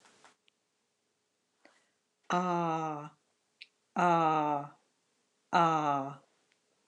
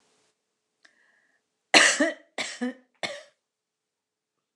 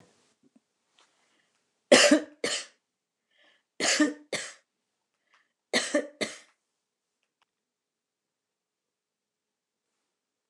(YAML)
exhalation_length: 6.9 s
exhalation_amplitude: 6694
exhalation_signal_mean_std_ratio: 0.4
cough_length: 4.6 s
cough_amplitude: 27279
cough_signal_mean_std_ratio: 0.26
three_cough_length: 10.5 s
three_cough_amplitude: 21444
three_cough_signal_mean_std_ratio: 0.24
survey_phase: beta (2021-08-13 to 2022-03-07)
age: 45-64
gender: Female
wearing_mask: 'No'
symptom_none: true
smoker_status: Never smoked
respiratory_condition_asthma: false
respiratory_condition_other: false
recruitment_source: REACT
submission_delay: 5 days
covid_test_result: Negative
covid_test_method: RT-qPCR
influenza_a_test_result: Negative
influenza_b_test_result: Negative